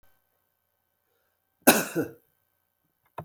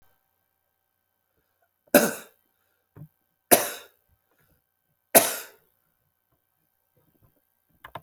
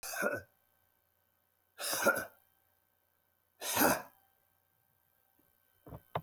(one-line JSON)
{"cough_length": "3.2 s", "cough_amplitude": 24738, "cough_signal_mean_std_ratio": 0.21, "three_cough_length": "8.0 s", "three_cough_amplitude": 32768, "three_cough_signal_mean_std_ratio": 0.18, "exhalation_length": "6.2 s", "exhalation_amplitude": 7012, "exhalation_signal_mean_std_ratio": 0.33, "survey_phase": "beta (2021-08-13 to 2022-03-07)", "age": "65+", "gender": "Male", "wearing_mask": "No", "symptom_none": true, "smoker_status": "Ex-smoker", "respiratory_condition_asthma": true, "respiratory_condition_other": false, "recruitment_source": "REACT", "submission_delay": "1 day", "covid_test_result": "Negative", "covid_test_method": "RT-qPCR"}